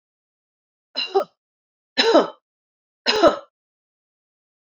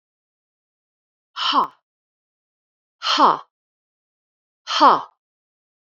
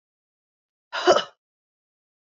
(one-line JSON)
{"three_cough_length": "4.6 s", "three_cough_amplitude": 26271, "three_cough_signal_mean_std_ratio": 0.3, "exhalation_length": "6.0 s", "exhalation_amplitude": 27695, "exhalation_signal_mean_std_ratio": 0.28, "cough_length": "2.3 s", "cough_amplitude": 21134, "cough_signal_mean_std_ratio": 0.23, "survey_phase": "beta (2021-08-13 to 2022-03-07)", "age": "45-64", "gender": "Female", "wearing_mask": "No", "symptom_none": true, "smoker_status": "Never smoked", "respiratory_condition_asthma": false, "respiratory_condition_other": false, "recruitment_source": "REACT", "submission_delay": "2 days", "covid_test_result": "Negative", "covid_test_method": "RT-qPCR", "influenza_a_test_result": "Negative", "influenza_b_test_result": "Negative"}